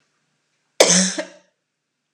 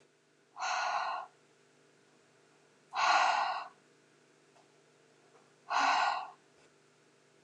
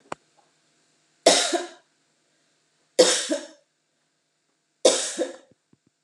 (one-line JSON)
{"cough_length": "2.1 s", "cough_amplitude": 29204, "cough_signal_mean_std_ratio": 0.31, "exhalation_length": "7.4 s", "exhalation_amplitude": 5281, "exhalation_signal_mean_std_ratio": 0.43, "three_cough_length": "6.0 s", "three_cough_amplitude": 27014, "three_cough_signal_mean_std_ratio": 0.3, "survey_phase": "beta (2021-08-13 to 2022-03-07)", "age": "45-64", "gender": "Female", "wearing_mask": "No", "symptom_none": true, "smoker_status": "Ex-smoker", "respiratory_condition_asthma": false, "respiratory_condition_other": false, "recruitment_source": "REACT", "submission_delay": "2 days", "covid_test_result": "Negative", "covid_test_method": "RT-qPCR"}